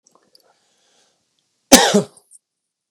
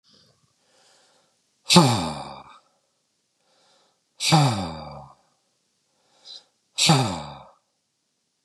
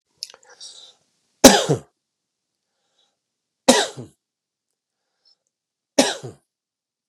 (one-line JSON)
{"cough_length": "2.9 s", "cough_amplitude": 32768, "cough_signal_mean_std_ratio": 0.23, "exhalation_length": "8.4 s", "exhalation_amplitude": 32244, "exhalation_signal_mean_std_ratio": 0.31, "three_cough_length": "7.1 s", "three_cough_amplitude": 32768, "three_cough_signal_mean_std_ratio": 0.21, "survey_phase": "beta (2021-08-13 to 2022-03-07)", "age": "45-64", "gender": "Male", "wearing_mask": "No", "symptom_cough_any": true, "symptom_runny_or_blocked_nose": true, "symptom_headache": true, "smoker_status": "Ex-smoker", "respiratory_condition_asthma": false, "respiratory_condition_other": false, "recruitment_source": "Test and Trace", "submission_delay": "2 days", "covid_test_result": "Positive", "covid_test_method": "LFT"}